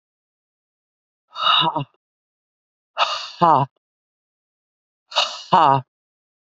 {
  "exhalation_length": "6.5 s",
  "exhalation_amplitude": 32768,
  "exhalation_signal_mean_std_ratio": 0.33,
  "survey_phase": "beta (2021-08-13 to 2022-03-07)",
  "age": "18-44",
  "gender": "Female",
  "wearing_mask": "No",
  "symptom_cough_any": true,
  "symptom_runny_or_blocked_nose": true,
  "symptom_sore_throat": true,
  "symptom_fatigue": true,
  "symptom_fever_high_temperature": true,
  "symptom_headache": true,
  "symptom_onset": "3 days",
  "smoker_status": "Never smoked",
  "respiratory_condition_asthma": false,
  "respiratory_condition_other": false,
  "recruitment_source": "Test and Trace",
  "submission_delay": "1 day",
  "covid_test_result": "Positive",
  "covid_test_method": "RT-qPCR",
  "covid_ct_value": 23.0,
  "covid_ct_gene": "ORF1ab gene"
}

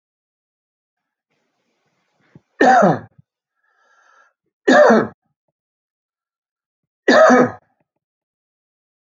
{
  "three_cough_length": "9.1 s",
  "three_cough_amplitude": 29144,
  "three_cough_signal_mean_std_ratio": 0.3,
  "survey_phase": "alpha (2021-03-01 to 2021-08-12)",
  "age": "65+",
  "gender": "Male",
  "wearing_mask": "No",
  "symptom_none": true,
  "smoker_status": "Ex-smoker",
  "respiratory_condition_asthma": false,
  "respiratory_condition_other": false,
  "recruitment_source": "REACT",
  "submission_delay": "1 day",
  "covid_test_result": "Negative",
  "covid_test_method": "RT-qPCR"
}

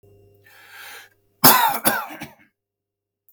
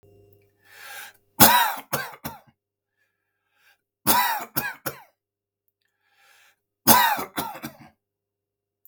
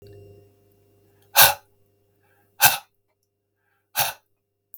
{
  "cough_length": "3.3 s",
  "cough_amplitude": 32768,
  "cough_signal_mean_std_ratio": 0.31,
  "three_cough_length": "8.9 s",
  "three_cough_amplitude": 32768,
  "three_cough_signal_mean_std_ratio": 0.3,
  "exhalation_length": "4.8 s",
  "exhalation_amplitude": 32768,
  "exhalation_signal_mean_std_ratio": 0.23,
  "survey_phase": "beta (2021-08-13 to 2022-03-07)",
  "age": "45-64",
  "gender": "Male",
  "wearing_mask": "No",
  "symptom_none": true,
  "smoker_status": "Ex-smoker",
  "respiratory_condition_asthma": false,
  "respiratory_condition_other": false,
  "recruitment_source": "REACT",
  "submission_delay": "1 day",
  "covid_test_result": "Negative",
  "covid_test_method": "RT-qPCR",
  "influenza_a_test_result": "Negative",
  "influenza_b_test_result": "Negative"
}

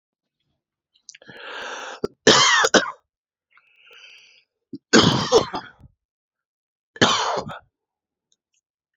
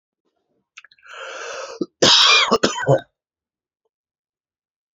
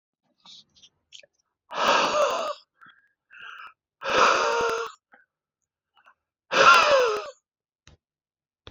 {
  "three_cough_length": "9.0 s",
  "three_cough_amplitude": 30360,
  "three_cough_signal_mean_std_ratio": 0.33,
  "cough_length": "4.9 s",
  "cough_amplitude": 32135,
  "cough_signal_mean_std_ratio": 0.36,
  "exhalation_length": "8.7 s",
  "exhalation_amplitude": 25608,
  "exhalation_signal_mean_std_ratio": 0.41,
  "survey_phase": "beta (2021-08-13 to 2022-03-07)",
  "age": "18-44",
  "gender": "Male",
  "wearing_mask": "No",
  "symptom_cough_any": true,
  "symptom_runny_or_blocked_nose": true,
  "symptom_sore_throat": true,
  "smoker_status": "Ex-smoker",
  "respiratory_condition_asthma": false,
  "respiratory_condition_other": false,
  "recruitment_source": "Test and Trace",
  "submission_delay": "1 day",
  "covid_test_result": "Positive",
  "covid_test_method": "RT-qPCR",
  "covid_ct_value": 17.1,
  "covid_ct_gene": "N gene",
  "covid_ct_mean": 18.2,
  "covid_viral_load": "1000000 copies/ml",
  "covid_viral_load_category": "High viral load (>1M copies/ml)"
}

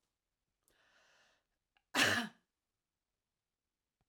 {
  "three_cough_length": "4.1 s",
  "three_cough_amplitude": 5010,
  "three_cough_signal_mean_std_ratio": 0.22,
  "survey_phase": "alpha (2021-03-01 to 2021-08-12)",
  "age": "45-64",
  "gender": "Female",
  "wearing_mask": "No",
  "symptom_none": true,
  "smoker_status": "Never smoked",
  "respiratory_condition_asthma": false,
  "respiratory_condition_other": false,
  "recruitment_source": "REACT",
  "submission_delay": "2 days",
  "covid_test_result": "Negative",
  "covid_test_method": "RT-qPCR"
}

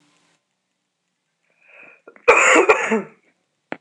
{
  "cough_length": "3.8 s",
  "cough_amplitude": 26028,
  "cough_signal_mean_std_ratio": 0.34,
  "survey_phase": "alpha (2021-03-01 to 2021-08-12)",
  "age": "18-44",
  "gender": "Female",
  "wearing_mask": "No",
  "symptom_none": true,
  "smoker_status": "Never smoked",
  "respiratory_condition_asthma": false,
  "respiratory_condition_other": false,
  "recruitment_source": "REACT",
  "submission_delay": "2 days",
  "covid_test_result": "Negative",
  "covid_test_method": "RT-qPCR"
}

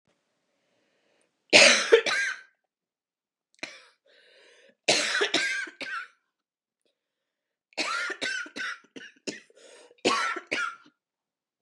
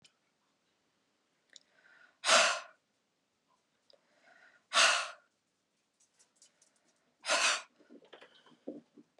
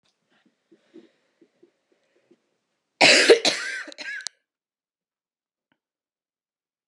{
  "three_cough_length": "11.6 s",
  "three_cough_amplitude": 28433,
  "three_cough_signal_mean_std_ratio": 0.34,
  "exhalation_length": "9.2 s",
  "exhalation_amplitude": 8724,
  "exhalation_signal_mean_std_ratio": 0.27,
  "cough_length": "6.9 s",
  "cough_amplitude": 28660,
  "cough_signal_mean_std_ratio": 0.23,
  "survey_phase": "beta (2021-08-13 to 2022-03-07)",
  "age": "18-44",
  "gender": "Female",
  "wearing_mask": "No",
  "symptom_cough_any": true,
  "symptom_runny_or_blocked_nose": true,
  "symptom_fatigue": true,
  "symptom_headache": true,
  "symptom_change_to_sense_of_smell_or_taste": true,
  "symptom_onset": "2 days",
  "smoker_status": "Never smoked",
  "respiratory_condition_asthma": false,
  "respiratory_condition_other": false,
  "recruitment_source": "Test and Trace",
  "submission_delay": "2 days",
  "covid_test_result": "Positive",
  "covid_test_method": "ePCR"
}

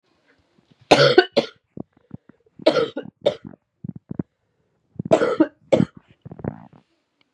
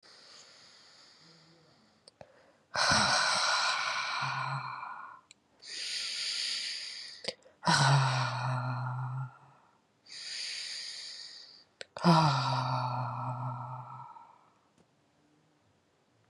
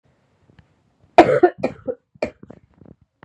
{
  "three_cough_length": "7.3 s",
  "three_cough_amplitude": 32768,
  "three_cough_signal_mean_std_ratio": 0.3,
  "exhalation_length": "16.3 s",
  "exhalation_amplitude": 9591,
  "exhalation_signal_mean_std_ratio": 0.56,
  "cough_length": "3.2 s",
  "cough_amplitude": 32768,
  "cough_signal_mean_std_ratio": 0.25,
  "survey_phase": "beta (2021-08-13 to 2022-03-07)",
  "age": "18-44",
  "gender": "Female",
  "wearing_mask": "No",
  "symptom_cough_any": true,
  "symptom_runny_or_blocked_nose": true,
  "symptom_sore_throat": true,
  "symptom_onset": "5 days",
  "smoker_status": "Ex-smoker",
  "respiratory_condition_asthma": false,
  "respiratory_condition_other": false,
  "recruitment_source": "Test and Trace",
  "submission_delay": "2 days",
  "covid_test_result": "Positive",
  "covid_test_method": "RT-qPCR",
  "covid_ct_value": 23.2,
  "covid_ct_gene": "ORF1ab gene",
  "covid_ct_mean": 23.7,
  "covid_viral_load": "17000 copies/ml",
  "covid_viral_load_category": "Low viral load (10K-1M copies/ml)"
}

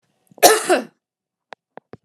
{
  "cough_length": "2.0 s",
  "cough_amplitude": 32768,
  "cough_signal_mean_std_ratio": 0.3,
  "survey_phase": "alpha (2021-03-01 to 2021-08-12)",
  "age": "45-64",
  "gender": "Female",
  "wearing_mask": "No",
  "symptom_none": true,
  "smoker_status": "Never smoked",
  "respiratory_condition_asthma": false,
  "respiratory_condition_other": false,
  "recruitment_source": "REACT",
  "submission_delay": "2 days",
  "covid_test_result": "Negative",
  "covid_test_method": "RT-qPCR"
}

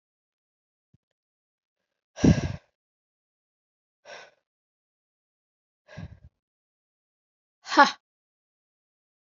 {
  "exhalation_length": "9.4 s",
  "exhalation_amplitude": 27917,
  "exhalation_signal_mean_std_ratio": 0.15,
  "survey_phase": "alpha (2021-03-01 to 2021-08-12)",
  "age": "18-44",
  "gender": "Female",
  "wearing_mask": "No",
  "symptom_cough_any": true,
  "symptom_new_continuous_cough": true,
  "symptom_shortness_of_breath": true,
  "symptom_abdominal_pain": true,
  "symptom_fatigue": true,
  "symptom_fever_high_temperature": true,
  "symptom_headache": true,
  "symptom_change_to_sense_of_smell_or_taste": true,
  "symptom_loss_of_taste": true,
  "smoker_status": "Never smoked",
  "respiratory_condition_asthma": false,
  "respiratory_condition_other": false,
  "recruitment_source": "Test and Trace",
  "submission_delay": "1 day",
  "covid_test_result": "Positive",
  "covid_test_method": "RT-qPCR",
  "covid_ct_value": 21.6,
  "covid_ct_gene": "ORF1ab gene",
  "covid_ct_mean": 23.5,
  "covid_viral_load": "20000 copies/ml",
  "covid_viral_load_category": "Low viral load (10K-1M copies/ml)"
}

